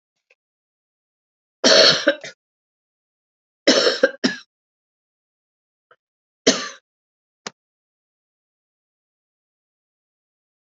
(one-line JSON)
{"three_cough_length": "10.8 s", "three_cough_amplitude": 32768, "three_cough_signal_mean_std_ratio": 0.24, "survey_phase": "beta (2021-08-13 to 2022-03-07)", "age": "65+", "gender": "Female", "wearing_mask": "No", "symptom_cough_any": true, "symptom_runny_or_blocked_nose": true, "symptom_change_to_sense_of_smell_or_taste": true, "smoker_status": "Never smoked", "respiratory_condition_asthma": false, "respiratory_condition_other": false, "recruitment_source": "Test and Trace", "submission_delay": "2 days", "covid_test_result": "Positive", "covid_test_method": "RT-qPCR", "covid_ct_value": 14.8, "covid_ct_gene": "ORF1ab gene", "covid_ct_mean": 15.1, "covid_viral_load": "11000000 copies/ml", "covid_viral_load_category": "High viral load (>1M copies/ml)"}